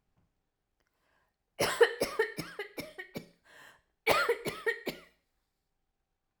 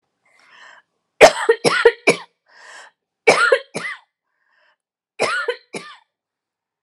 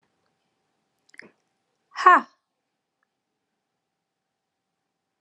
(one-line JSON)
{"cough_length": "6.4 s", "cough_amplitude": 11074, "cough_signal_mean_std_ratio": 0.34, "three_cough_length": "6.8 s", "three_cough_amplitude": 32768, "three_cough_signal_mean_std_ratio": 0.31, "exhalation_length": "5.2 s", "exhalation_amplitude": 28442, "exhalation_signal_mean_std_ratio": 0.15, "survey_phase": "alpha (2021-03-01 to 2021-08-12)", "age": "18-44", "gender": "Female", "wearing_mask": "No", "symptom_none": true, "symptom_onset": "5 days", "smoker_status": "Never smoked", "respiratory_condition_asthma": true, "respiratory_condition_other": false, "recruitment_source": "REACT", "submission_delay": "1 day", "covid_test_result": "Negative", "covid_test_method": "RT-qPCR"}